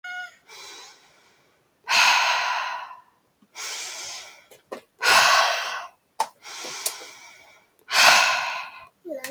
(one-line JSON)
{"exhalation_length": "9.3 s", "exhalation_amplitude": 25661, "exhalation_signal_mean_std_ratio": 0.47, "survey_phase": "beta (2021-08-13 to 2022-03-07)", "age": "18-44", "gender": "Female", "wearing_mask": "No", "symptom_cough_any": true, "symptom_runny_or_blocked_nose": true, "symptom_shortness_of_breath": true, "symptom_fatigue": true, "symptom_headache": true, "symptom_onset": "10 days", "smoker_status": "Ex-smoker", "respiratory_condition_asthma": false, "respiratory_condition_other": false, "recruitment_source": "Test and Trace", "submission_delay": "3 days", "covid_test_result": "Positive", "covid_test_method": "RT-qPCR", "covid_ct_value": 23.1, "covid_ct_gene": "ORF1ab gene", "covid_ct_mean": 23.8, "covid_viral_load": "16000 copies/ml", "covid_viral_load_category": "Low viral load (10K-1M copies/ml)"}